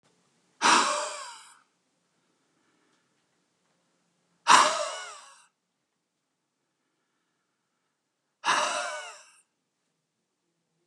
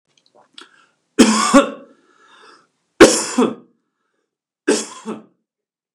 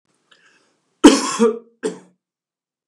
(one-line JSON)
{"exhalation_length": "10.9 s", "exhalation_amplitude": 21363, "exhalation_signal_mean_std_ratio": 0.27, "three_cough_length": "5.9 s", "three_cough_amplitude": 32768, "three_cough_signal_mean_std_ratio": 0.31, "cough_length": "2.9 s", "cough_amplitude": 32768, "cough_signal_mean_std_ratio": 0.28, "survey_phase": "beta (2021-08-13 to 2022-03-07)", "age": "45-64", "gender": "Male", "wearing_mask": "No", "symptom_none": true, "smoker_status": "Ex-smoker", "respiratory_condition_asthma": false, "respiratory_condition_other": false, "recruitment_source": "REACT", "submission_delay": "3 days", "covid_test_result": "Negative", "covid_test_method": "RT-qPCR", "influenza_a_test_result": "Negative", "influenza_b_test_result": "Negative"}